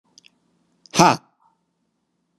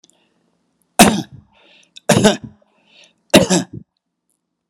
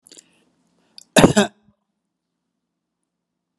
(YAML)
exhalation_length: 2.4 s
exhalation_amplitude: 32767
exhalation_signal_mean_std_ratio: 0.2
three_cough_length: 4.7 s
three_cough_amplitude: 32768
three_cough_signal_mean_std_ratio: 0.3
cough_length: 3.6 s
cough_amplitude: 32768
cough_signal_mean_std_ratio: 0.19
survey_phase: beta (2021-08-13 to 2022-03-07)
age: 65+
gender: Male
wearing_mask: 'No'
symptom_none: true
smoker_status: Never smoked
respiratory_condition_asthma: false
respiratory_condition_other: false
recruitment_source: REACT
submission_delay: 7 days
covid_test_result: Negative
covid_test_method: RT-qPCR
influenza_a_test_result: Negative
influenza_b_test_result: Negative